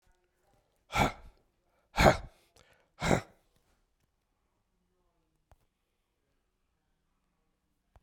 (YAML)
exhalation_length: 8.0 s
exhalation_amplitude: 14692
exhalation_signal_mean_std_ratio: 0.2
survey_phase: beta (2021-08-13 to 2022-03-07)
age: 45-64
gender: Male
wearing_mask: 'No'
symptom_cough_any: true
symptom_shortness_of_breath: true
symptom_fatigue: true
symptom_onset: 4 days
smoker_status: Ex-smoker
respiratory_condition_asthma: false
respiratory_condition_other: false
recruitment_source: Test and Trace
submission_delay: 2 days
covid_test_result: Positive
covid_test_method: RT-qPCR
covid_ct_value: 19.4
covid_ct_gene: ORF1ab gene